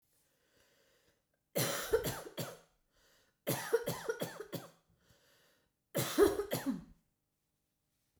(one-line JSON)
{"three_cough_length": "8.2 s", "three_cough_amplitude": 5522, "three_cough_signal_mean_std_ratio": 0.38, "survey_phase": "beta (2021-08-13 to 2022-03-07)", "age": "45-64", "gender": "Female", "wearing_mask": "No", "symptom_cough_any": true, "symptom_runny_or_blocked_nose": true, "symptom_fatigue": true, "symptom_change_to_sense_of_smell_or_taste": true, "symptom_onset": "8 days", "smoker_status": "Never smoked", "respiratory_condition_asthma": true, "respiratory_condition_other": false, "recruitment_source": "Test and Trace", "submission_delay": "1 day", "covid_test_result": "Positive", "covid_test_method": "RT-qPCR", "covid_ct_value": 25.3, "covid_ct_gene": "N gene"}